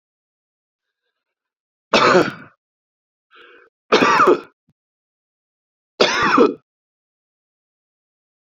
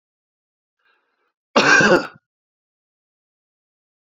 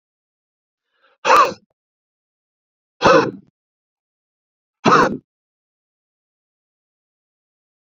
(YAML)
three_cough_length: 8.4 s
three_cough_amplitude: 32767
three_cough_signal_mean_std_ratio: 0.32
cough_length: 4.2 s
cough_amplitude: 28106
cough_signal_mean_std_ratio: 0.27
exhalation_length: 7.9 s
exhalation_amplitude: 32768
exhalation_signal_mean_std_ratio: 0.25
survey_phase: beta (2021-08-13 to 2022-03-07)
age: 45-64
gender: Male
wearing_mask: 'No'
symptom_cough_any: true
symptom_runny_or_blocked_nose: true
symptom_sore_throat: true
symptom_fatigue: true
symptom_headache: true
symptom_onset: 2 days
smoker_status: Never smoked
respiratory_condition_asthma: false
respiratory_condition_other: false
recruitment_source: Test and Trace
submission_delay: 1 day
covid_test_result: Positive
covid_test_method: RT-qPCR